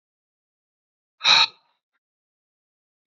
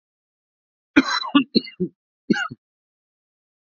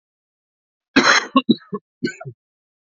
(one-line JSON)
{"exhalation_length": "3.1 s", "exhalation_amplitude": 23051, "exhalation_signal_mean_std_ratio": 0.21, "cough_length": "3.7 s", "cough_amplitude": 27232, "cough_signal_mean_std_ratio": 0.29, "three_cough_length": "2.8 s", "three_cough_amplitude": 28787, "three_cough_signal_mean_std_ratio": 0.33, "survey_phase": "alpha (2021-03-01 to 2021-08-12)", "age": "18-44", "gender": "Male", "wearing_mask": "No", "symptom_cough_any": true, "symptom_new_continuous_cough": true, "symptom_shortness_of_breath": true, "symptom_fever_high_temperature": true, "symptom_headache": true, "symptom_change_to_sense_of_smell_or_taste": true, "symptom_onset": "6 days", "smoker_status": "Current smoker (1 to 10 cigarettes per day)", "respiratory_condition_asthma": false, "respiratory_condition_other": false, "recruitment_source": "Test and Trace", "submission_delay": "2 days", "covid_test_result": "Positive", "covid_test_method": "RT-qPCR", "covid_ct_value": 12.5, "covid_ct_gene": "ORF1ab gene", "covid_ct_mean": 12.9, "covid_viral_load": "57000000 copies/ml", "covid_viral_load_category": "High viral load (>1M copies/ml)"}